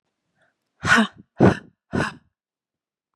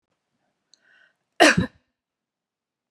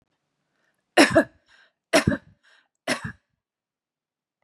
{"exhalation_length": "3.2 s", "exhalation_amplitude": 28263, "exhalation_signal_mean_std_ratio": 0.31, "cough_length": "2.9 s", "cough_amplitude": 28845, "cough_signal_mean_std_ratio": 0.21, "three_cough_length": "4.4 s", "three_cough_amplitude": 27975, "three_cough_signal_mean_std_ratio": 0.25, "survey_phase": "beta (2021-08-13 to 2022-03-07)", "age": "45-64", "gender": "Female", "wearing_mask": "No", "symptom_none": true, "smoker_status": "Ex-smoker", "respiratory_condition_asthma": false, "respiratory_condition_other": false, "recruitment_source": "REACT", "submission_delay": "1 day", "covid_test_result": "Negative", "covid_test_method": "RT-qPCR"}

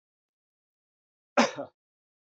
{"cough_length": "2.4 s", "cough_amplitude": 14057, "cough_signal_mean_std_ratio": 0.19, "survey_phase": "beta (2021-08-13 to 2022-03-07)", "age": "45-64", "gender": "Male", "wearing_mask": "No", "symptom_none": true, "smoker_status": "Ex-smoker", "respiratory_condition_asthma": false, "respiratory_condition_other": false, "recruitment_source": "Test and Trace", "submission_delay": "1 day", "covid_test_result": "Negative", "covid_test_method": "RT-qPCR"}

